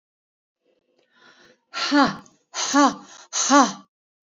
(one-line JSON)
{"exhalation_length": "4.4 s", "exhalation_amplitude": 23983, "exhalation_signal_mean_std_ratio": 0.38, "survey_phase": "beta (2021-08-13 to 2022-03-07)", "age": "45-64", "gender": "Female", "wearing_mask": "Yes", "symptom_none": true, "smoker_status": "Ex-smoker", "respiratory_condition_asthma": false, "respiratory_condition_other": false, "recruitment_source": "REACT", "submission_delay": "7 days", "covid_test_result": "Negative", "covid_test_method": "RT-qPCR", "influenza_a_test_result": "Negative", "influenza_b_test_result": "Negative"}